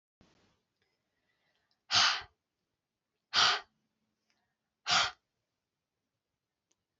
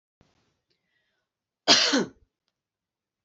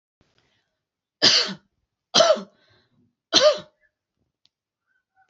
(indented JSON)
{
  "exhalation_length": "7.0 s",
  "exhalation_amplitude": 7996,
  "exhalation_signal_mean_std_ratio": 0.26,
  "cough_length": "3.2 s",
  "cough_amplitude": 24334,
  "cough_signal_mean_std_ratio": 0.26,
  "three_cough_length": "5.3 s",
  "three_cough_amplitude": 30908,
  "three_cough_signal_mean_std_ratio": 0.3,
  "survey_phase": "beta (2021-08-13 to 2022-03-07)",
  "age": "45-64",
  "gender": "Female",
  "wearing_mask": "No",
  "symptom_cough_any": true,
  "symptom_runny_or_blocked_nose": true,
  "smoker_status": "Ex-smoker",
  "respiratory_condition_asthma": false,
  "respiratory_condition_other": false,
  "recruitment_source": "Test and Trace",
  "submission_delay": "2 days",
  "covid_test_result": "Positive",
  "covid_test_method": "LFT"
}